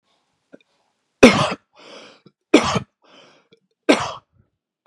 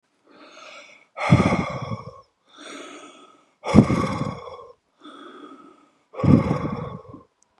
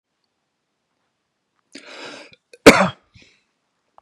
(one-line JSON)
{"three_cough_length": "4.9 s", "three_cough_amplitude": 32768, "three_cough_signal_mean_std_ratio": 0.26, "exhalation_length": "7.6 s", "exhalation_amplitude": 32768, "exhalation_signal_mean_std_ratio": 0.38, "cough_length": "4.0 s", "cough_amplitude": 32768, "cough_signal_mean_std_ratio": 0.18, "survey_phase": "beta (2021-08-13 to 2022-03-07)", "age": "45-64", "gender": "Male", "wearing_mask": "No", "symptom_none": true, "smoker_status": "Ex-smoker", "respiratory_condition_asthma": false, "respiratory_condition_other": false, "recruitment_source": "REACT", "submission_delay": "1 day", "covid_test_result": "Negative", "covid_test_method": "RT-qPCR", "influenza_a_test_result": "Negative", "influenza_b_test_result": "Negative"}